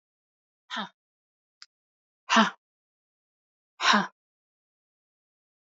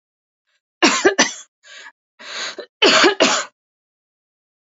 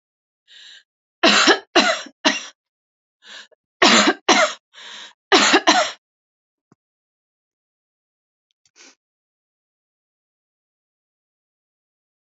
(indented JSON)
{
  "exhalation_length": "5.6 s",
  "exhalation_amplitude": 18413,
  "exhalation_signal_mean_std_ratio": 0.22,
  "cough_length": "4.8 s",
  "cough_amplitude": 32745,
  "cough_signal_mean_std_ratio": 0.38,
  "three_cough_length": "12.4 s",
  "three_cough_amplitude": 32654,
  "three_cough_signal_mean_std_ratio": 0.3,
  "survey_phase": "alpha (2021-03-01 to 2021-08-12)",
  "age": "45-64",
  "gender": "Female",
  "wearing_mask": "No",
  "symptom_fatigue": true,
  "symptom_headache": true,
  "smoker_status": "Ex-smoker",
  "respiratory_condition_asthma": false,
  "respiratory_condition_other": false,
  "recruitment_source": "Test and Trace",
  "submission_delay": "2 days",
  "covid_test_result": "Positive",
  "covid_test_method": "RT-qPCR",
  "covid_ct_value": 16.3,
  "covid_ct_gene": "ORF1ab gene",
  "covid_ct_mean": 17.1,
  "covid_viral_load": "2400000 copies/ml",
  "covid_viral_load_category": "High viral load (>1M copies/ml)"
}